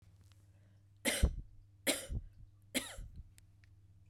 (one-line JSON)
{"three_cough_length": "4.1 s", "three_cough_amplitude": 4511, "three_cough_signal_mean_std_ratio": 0.38, "survey_phase": "beta (2021-08-13 to 2022-03-07)", "age": "45-64", "gender": "Female", "wearing_mask": "No", "symptom_runny_or_blocked_nose": true, "symptom_fatigue": true, "symptom_fever_high_temperature": true, "symptom_headache": true, "symptom_change_to_sense_of_smell_or_taste": true, "symptom_loss_of_taste": true, "symptom_onset": "2 days", "smoker_status": "Never smoked", "respiratory_condition_asthma": false, "respiratory_condition_other": false, "recruitment_source": "Test and Trace", "submission_delay": "2 days", "covid_test_result": "Positive", "covid_test_method": "RT-qPCR", "covid_ct_value": 21.5, "covid_ct_gene": "ORF1ab gene"}